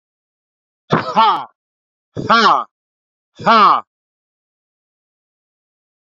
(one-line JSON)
{"exhalation_length": "6.1 s", "exhalation_amplitude": 27956, "exhalation_signal_mean_std_ratio": 0.35, "survey_phase": "beta (2021-08-13 to 2022-03-07)", "age": "18-44", "gender": "Male", "wearing_mask": "No", "symptom_cough_any": true, "symptom_runny_or_blocked_nose": true, "symptom_shortness_of_breath": true, "symptom_sore_throat": true, "symptom_other": true, "symptom_onset": "6 days", "smoker_status": "Current smoker (1 to 10 cigarettes per day)", "respiratory_condition_asthma": false, "respiratory_condition_other": false, "recruitment_source": "Test and Trace", "submission_delay": "3 days", "covid_test_result": "Positive", "covid_test_method": "RT-qPCR", "covid_ct_value": 23.1, "covid_ct_gene": "N gene", "covid_ct_mean": 23.2, "covid_viral_load": "24000 copies/ml", "covid_viral_load_category": "Low viral load (10K-1M copies/ml)"}